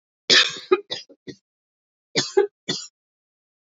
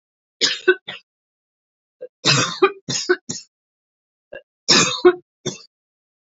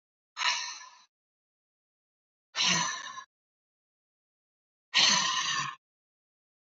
{"cough_length": "3.7 s", "cough_amplitude": 26038, "cough_signal_mean_std_ratio": 0.31, "three_cough_length": "6.3 s", "three_cough_amplitude": 29876, "three_cough_signal_mean_std_ratio": 0.34, "exhalation_length": "6.7 s", "exhalation_amplitude": 10195, "exhalation_signal_mean_std_ratio": 0.38, "survey_phase": "alpha (2021-03-01 to 2021-08-12)", "age": "45-64", "gender": "Female", "wearing_mask": "No", "symptom_none": true, "smoker_status": "Never smoked", "respiratory_condition_asthma": true, "respiratory_condition_other": false, "recruitment_source": "REACT", "submission_delay": "3 days", "covid_test_result": "Negative", "covid_test_method": "RT-qPCR"}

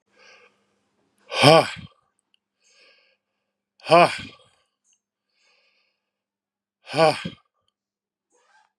{"exhalation_length": "8.8 s", "exhalation_amplitude": 32764, "exhalation_signal_mean_std_ratio": 0.22, "survey_phase": "beta (2021-08-13 to 2022-03-07)", "age": "45-64", "gender": "Male", "wearing_mask": "No", "symptom_runny_or_blocked_nose": true, "symptom_fatigue": true, "symptom_onset": "12 days", "smoker_status": "Never smoked", "respiratory_condition_asthma": false, "respiratory_condition_other": false, "recruitment_source": "REACT", "submission_delay": "2 days", "covid_test_result": "Negative", "covid_test_method": "RT-qPCR", "influenza_a_test_result": "Negative", "influenza_b_test_result": "Negative"}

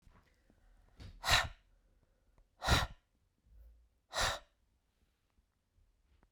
{"exhalation_length": "6.3 s", "exhalation_amplitude": 6128, "exhalation_signal_mean_std_ratio": 0.28, "survey_phase": "beta (2021-08-13 to 2022-03-07)", "age": "45-64", "gender": "Female", "wearing_mask": "No", "symptom_none": true, "smoker_status": "Ex-smoker", "respiratory_condition_asthma": false, "respiratory_condition_other": false, "recruitment_source": "REACT", "submission_delay": "0 days", "covid_test_result": "Negative", "covid_test_method": "RT-qPCR"}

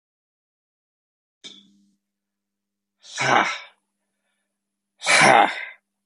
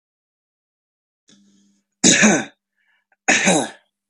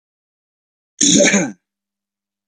{"exhalation_length": "6.1 s", "exhalation_amplitude": 28014, "exhalation_signal_mean_std_ratio": 0.29, "three_cough_length": "4.1 s", "three_cough_amplitude": 32767, "three_cough_signal_mean_std_ratio": 0.35, "cough_length": "2.5 s", "cough_amplitude": 31782, "cough_signal_mean_std_ratio": 0.36, "survey_phase": "beta (2021-08-13 to 2022-03-07)", "age": "18-44", "gender": "Male", "wearing_mask": "No", "symptom_none": true, "smoker_status": "Never smoked", "respiratory_condition_asthma": true, "respiratory_condition_other": false, "recruitment_source": "Test and Trace", "submission_delay": "1 day", "covid_test_result": "Negative", "covid_test_method": "RT-qPCR"}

